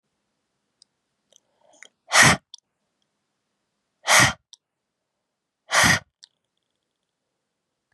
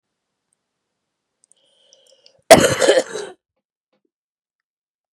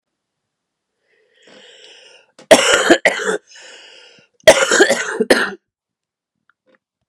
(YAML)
exhalation_length: 7.9 s
exhalation_amplitude: 28582
exhalation_signal_mean_std_ratio: 0.24
cough_length: 5.1 s
cough_amplitude: 32768
cough_signal_mean_std_ratio: 0.22
three_cough_length: 7.1 s
three_cough_amplitude: 32768
three_cough_signal_mean_std_ratio: 0.34
survey_phase: beta (2021-08-13 to 2022-03-07)
age: 18-44
gender: Female
wearing_mask: 'No'
symptom_cough_any: true
symptom_runny_or_blocked_nose: true
symptom_headache: true
smoker_status: Ex-smoker
respiratory_condition_asthma: false
respiratory_condition_other: false
recruitment_source: Test and Trace
submission_delay: 2 days
covid_test_result: Positive
covid_test_method: RT-qPCR
covid_ct_value: 17.9
covid_ct_gene: ORF1ab gene
covid_ct_mean: 18.9
covid_viral_load: 610000 copies/ml
covid_viral_load_category: Low viral load (10K-1M copies/ml)